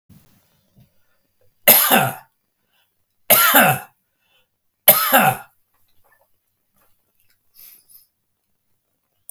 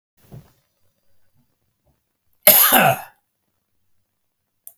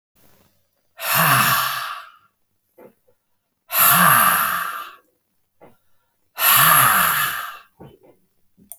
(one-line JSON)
{"three_cough_length": "9.3 s", "three_cough_amplitude": 32768, "three_cough_signal_mean_std_ratio": 0.3, "cough_length": "4.8 s", "cough_amplitude": 32768, "cough_signal_mean_std_ratio": 0.26, "exhalation_length": "8.8 s", "exhalation_amplitude": 29342, "exhalation_signal_mean_std_ratio": 0.49, "survey_phase": "beta (2021-08-13 to 2022-03-07)", "age": "65+", "gender": "Male", "wearing_mask": "No", "symptom_fatigue": true, "symptom_headache": true, "smoker_status": "Never smoked", "respiratory_condition_asthma": false, "respiratory_condition_other": false, "recruitment_source": "Test and Trace", "submission_delay": "2 days", "covid_test_result": "Positive", "covid_test_method": "RT-qPCR", "covid_ct_value": 31.6, "covid_ct_gene": "N gene"}